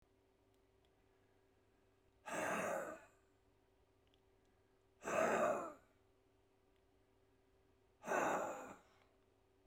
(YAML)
exhalation_length: 9.7 s
exhalation_amplitude: 2218
exhalation_signal_mean_std_ratio: 0.38
survey_phase: beta (2021-08-13 to 2022-03-07)
age: 65+
gender: Male
wearing_mask: 'No'
symptom_runny_or_blocked_nose: true
symptom_headache: true
smoker_status: Current smoker (11 or more cigarettes per day)
respiratory_condition_asthma: false
respiratory_condition_other: true
recruitment_source: Test and Trace
submission_delay: 2 days
covid_test_result: Positive
covid_test_method: RT-qPCR
covid_ct_value: 21.1
covid_ct_gene: N gene